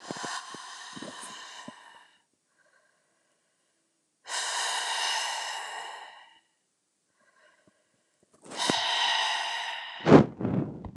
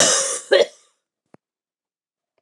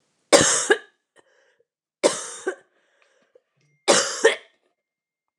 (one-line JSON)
{"exhalation_length": "11.0 s", "exhalation_amplitude": 26709, "exhalation_signal_mean_std_ratio": 0.4, "cough_length": "2.4 s", "cough_amplitude": 28809, "cough_signal_mean_std_ratio": 0.36, "three_cough_length": "5.4 s", "three_cough_amplitude": 29203, "three_cough_signal_mean_std_ratio": 0.32, "survey_phase": "beta (2021-08-13 to 2022-03-07)", "age": "45-64", "gender": "Female", "wearing_mask": "No", "symptom_cough_any": true, "symptom_runny_or_blocked_nose": true, "symptom_fever_high_temperature": true, "symptom_headache": true, "symptom_change_to_sense_of_smell_or_taste": true, "symptom_loss_of_taste": true, "symptom_onset": "3 days", "smoker_status": "Never smoked", "respiratory_condition_asthma": false, "respiratory_condition_other": false, "recruitment_source": "Test and Trace", "submission_delay": "2 days", "covid_test_result": "Positive", "covid_test_method": "RT-qPCR", "covid_ct_value": 17.0, "covid_ct_gene": "ORF1ab gene", "covid_ct_mean": 17.5, "covid_viral_load": "1800000 copies/ml", "covid_viral_load_category": "High viral load (>1M copies/ml)"}